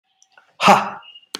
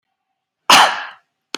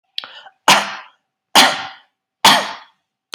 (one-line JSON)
{"exhalation_length": "1.4 s", "exhalation_amplitude": 32768, "exhalation_signal_mean_std_ratio": 0.34, "cough_length": "1.6 s", "cough_amplitude": 32768, "cough_signal_mean_std_ratio": 0.34, "three_cough_length": "3.3 s", "three_cough_amplitude": 32768, "three_cough_signal_mean_std_ratio": 0.36, "survey_phase": "beta (2021-08-13 to 2022-03-07)", "age": "45-64", "gender": "Male", "wearing_mask": "No", "symptom_none": true, "smoker_status": "Never smoked", "respiratory_condition_asthma": false, "respiratory_condition_other": false, "recruitment_source": "REACT", "submission_delay": "1 day", "covid_test_result": "Negative", "covid_test_method": "RT-qPCR", "influenza_a_test_result": "Negative", "influenza_b_test_result": "Negative"}